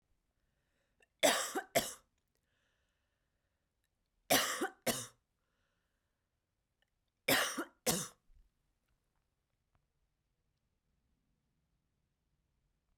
{"three_cough_length": "13.0 s", "three_cough_amplitude": 5944, "three_cough_signal_mean_std_ratio": 0.25, "survey_phase": "alpha (2021-03-01 to 2021-08-12)", "age": "45-64", "gender": "Female", "wearing_mask": "No", "symptom_cough_any": true, "symptom_abdominal_pain": true, "symptom_fatigue": true, "symptom_headache": true, "symptom_change_to_sense_of_smell_or_taste": true, "smoker_status": "Never smoked", "respiratory_condition_asthma": false, "respiratory_condition_other": false, "recruitment_source": "Test and Trace", "submission_delay": "2 days", "covid_test_result": "Positive", "covid_test_method": "RT-qPCR", "covid_ct_value": 15.7, "covid_ct_gene": "ORF1ab gene", "covid_ct_mean": 16.1, "covid_viral_load": "5200000 copies/ml", "covid_viral_load_category": "High viral load (>1M copies/ml)"}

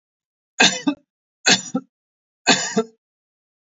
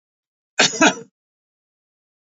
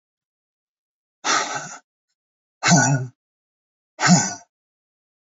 {"three_cough_length": "3.7 s", "three_cough_amplitude": 30272, "three_cough_signal_mean_std_ratio": 0.34, "cough_length": "2.2 s", "cough_amplitude": 29618, "cough_signal_mean_std_ratio": 0.27, "exhalation_length": "5.4 s", "exhalation_amplitude": 25043, "exhalation_signal_mean_std_ratio": 0.34, "survey_phase": "beta (2021-08-13 to 2022-03-07)", "age": "65+", "gender": "Male", "wearing_mask": "No", "symptom_none": true, "smoker_status": "Never smoked", "respiratory_condition_asthma": false, "respiratory_condition_other": false, "recruitment_source": "REACT", "submission_delay": "2 days", "covid_test_result": "Negative", "covid_test_method": "RT-qPCR", "influenza_a_test_result": "Negative", "influenza_b_test_result": "Negative"}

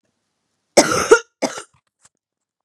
{"cough_length": "2.6 s", "cough_amplitude": 32768, "cough_signal_mean_std_ratio": 0.28, "survey_phase": "beta (2021-08-13 to 2022-03-07)", "age": "18-44", "gender": "Female", "wearing_mask": "No", "symptom_cough_any": true, "symptom_runny_or_blocked_nose": true, "symptom_sore_throat": true, "symptom_fatigue": true, "symptom_headache": true, "symptom_onset": "3 days", "smoker_status": "Never smoked", "respiratory_condition_asthma": false, "respiratory_condition_other": false, "recruitment_source": "Test and Trace", "submission_delay": "1 day", "covid_test_result": "Positive", "covid_test_method": "RT-qPCR", "covid_ct_value": 18.0, "covid_ct_gene": "ORF1ab gene", "covid_ct_mean": 18.1, "covid_viral_load": "1200000 copies/ml", "covid_viral_load_category": "High viral load (>1M copies/ml)"}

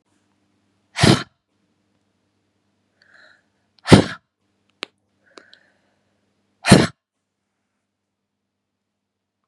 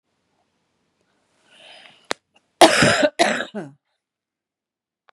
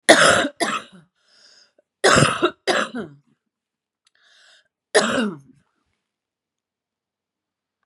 {"exhalation_length": "9.5 s", "exhalation_amplitude": 32768, "exhalation_signal_mean_std_ratio": 0.18, "cough_length": "5.1 s", "cough_amplitude": 32768, "cough_signal_mean_std_ratio": 0.28, "three_cough_length": "7.9 s", "three_cough_amplitude": 32768, "three_cough_signal_mean_std_ratio": 0.34, "survey_phase": "beta (2021-08-13 to 2022-03-07)", "age": "45-64", "gender": "Female", "wearing_mask": "No", "symptom_cough_any": true, "symptom_runny_or_blocked_nose": true, "symptom_fatigue": true, "symptom_other": true, "smoker_status": "Current smoker (1 to 10 cigarettes per day)", "respiratory_condition_asthma": false, "respiratory_condition_other": false, "recruitment_source": "Test and Trace", "submission_delay": "2 days", "covid_test_result": "Positive", "covid_test_method": "ePCR"}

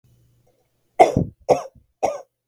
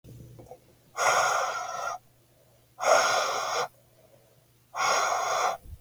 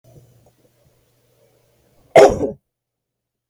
{"three_cough_length": "2.5 s", "three_cough_amplitude": 32768, "three_cough_signal_mean_std_ratio": 0.29, "exhalation_length": "5.8 s", "exhalation_amplitude": 11806, "exhalation_signal_mean_std_ratio": 0.6, "cough_length": "3.5 s", "cough_amplitude": 32768, "cough_signal_mean_std_ratio": 0.22, "survey_phase": "beta (2021-08-13 to 2022-03-07)", "age": "45-64", "gender": "Female", "wearing_mask": "No", "symptom_none": true, "smoker_status": "Never smoked", "respiratory_condition_asthma": true, "respiratory_condition_other": false, "recruitment_source": "REACT", "submission_delay": "1 day", "covid_test_result": "Negative", "covid_test_method": "RT-qPCR"}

